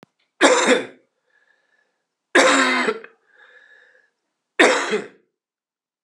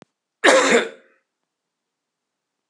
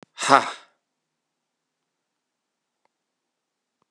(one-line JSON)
{"three_cough_length": "6.0 s", "three_cough_amplitude": 32767, "three_cough_signal_mean_std_ratio": 0.39, "cough_length": "2.7 s", "cough_amplitude": 32074, "cough_signal_mean_std_ratio": 0.32, "exhalation_length": "3.9 s", "exhalation_amplitude": 32768, "exhalation_signal_mean_std_ratio": 0.15, "survey_phase": "alpha (2021-03-01 to 2021-08-12)", "age": "45-64", "gender": "Male", "wearing_mask": "No", "symptom_cough_any": true, "symptom_loss_of_taste": true, "symptom_onset": "5 days", "smoker_status": "Never smoked", "respiratory_condition_asthma": false, "respiratory_condition_other": false, "recruitment_source": "Test and Trace", "submission_delay": "2 days", "covid_test_result": "Positive", "covid_test_method": "RT-qPCR", "covid_ct_value": 16.7, "covid_ct_gene": "ORF1ab gene", "covid_ct_mean": 17.2, "covid_viral_load": "2300000 copies/ml", "covid_viral_load_category": "High viral load (>1M copies/ml)"}